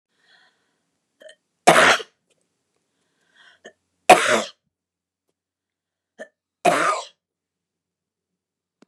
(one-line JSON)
{"three_cough_length": "8.9 s", "three_cough_amplitude": 29204, "three_cough_signal_mean_std_ratio": 0.24, "survey_phase": "beta (2021-08-13 to 2022-03-07)", "age": "65+", "gender": "Female", "wearing_mask": "No", "symptom_none": true, "smoker_status": "Never smoked", "respiratory_condition_asthma": false, "respiratory_condition_other": false, "recruitment_source": "REACT", "submission_delay": "1 day", "covid_test_result": "Negative", "covid_test_method": "RT-qPCR", "influenza_a_test_result": "Negative", "influenza_b_test_result": "Negative"}